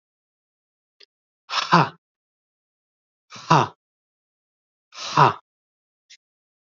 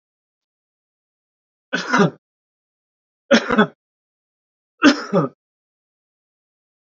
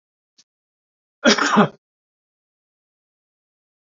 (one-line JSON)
{"exhalation_length": "6.7 s", "exhalation_amplitude": 29550, "exhalation_signal_mean_std_ratio": 0.23, "three_cough_length": "6.9 s", "three_cough_amplitude": 31903, "three_cough_signal_mean_std_ratio": 0.27, "cough_length": "3.8 s", "cough_amplitude": 28635, "cough_signal_mean_std_ratio": 0.24, "survey_phase": "alpha (2021-03-01 to 2021-08-12)", "age": "45-64", "gender": "Male", "wearing_mask": "No", "symptom_none": true, "smoker_status": "Never smoked", "respiratory_condition_asthma": false, "respiratory_condition_other": false, "recruitment_source": "REACT", "submission_delay": "2 days", "covid_test_result": "Negative", "covid_test_method": "RT-qPCR"}